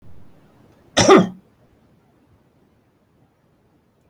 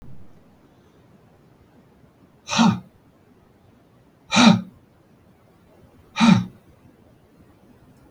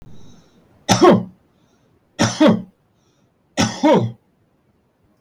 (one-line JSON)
{"cough_length": "4.1 s", "cough_amplitude": 32768, "cough_signal_mean_std_ratio": 0.23, "exhalation_length": "8.1 s", "exhalation_amplitude": 29737, "exhalation_signal_mean_std_ratio": 0.28, "three_cough_length": "5.2 s", "three_cough_amplitude": 32768, "three_cough_signal_mean_std_ratio": 0.38, "survey_phase": "beta (2021-08-13 to 2022-03-07)", "age": "65+", "gender": "Male", "wearing_mask": "No", "symptom_none": true, "smoker_status": "Never smoked", "respiratory_condition_asthma": false, "respiratory_condition_other": false, "recruitment_source": "REACT", "submission_delay": "2 days", "covid_test_result": "Negative", "covid_test_method": "RT-qPCR", "influenza_a_test_result": "Negative", "influenza_b_test_result": "Negative"}